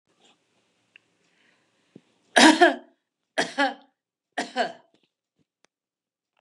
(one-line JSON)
{"three_cough_length": "6.4 s", "three_cough_amplitude": 30890, "three_cough_signal_mean_std_ratio": 0.24, "survey_phase": "beta (2021-08-13 to 2022-03-07)", "age": "65+", "gender": "Female", "wearing_mask": "No", "symptom_none": true, "smoker_status": "Never smoked", "respiratory_condition_asthma": false, "respiratory_condition_other": false, "recruitment_source": "REACT", "submission_delay": "2 days", "covid_test_result": "Negative", "covid_test_method": "RT-qPCR", "influenza_a_test_result": "Negative", "influenza_b_test_result": "Negative"}